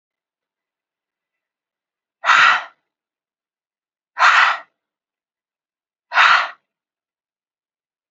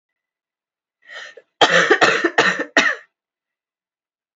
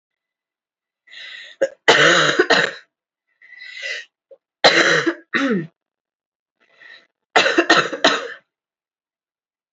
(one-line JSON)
{"exhalation_length": "8.1 s", "exhalation_amplitude": 32767, "exhalation_signal_mean_std_ratio": 0.29, "cough_length": "4.4 s", "cough_amplitude": 31652, "cough_signal_mean_std_ratio": 0.39, "three_cough_length": "9.7 s", "three_cough_amplitude": 32768, "three_cough_signal_mean_std_ratio": 0.4, "survey_phase": "alpha (2021-03-01 to 2021-08-12)", "age": "18-44", "gender": "Female", "wearing_mask": "No", "symptom_cough_any": true, "symptom_shortness_of_breath": true, "symptom_fatigue": true, "symptom_fever_high_temperature": true, "symptom_headache": true, "symptom_onset": "3 days", "smoker_status": "Never smoked", "respiratory_condition_asthma": false, "respiratory_condition_other": false, "recruitment_source": "Test and Trace", "submission_delay": "1 day", "covid_test_result": "Positive", "covid_test_method": "RT-qPCR", "covid_ct_value": 13.2, "covid_ct_gene": "ORF1ab gene", "covid_ct_mean": 14.0, "covid_viral_load": "25000000 copies/ml", "covid_viral_load_category": "High viral load (>1M copies/ml)"}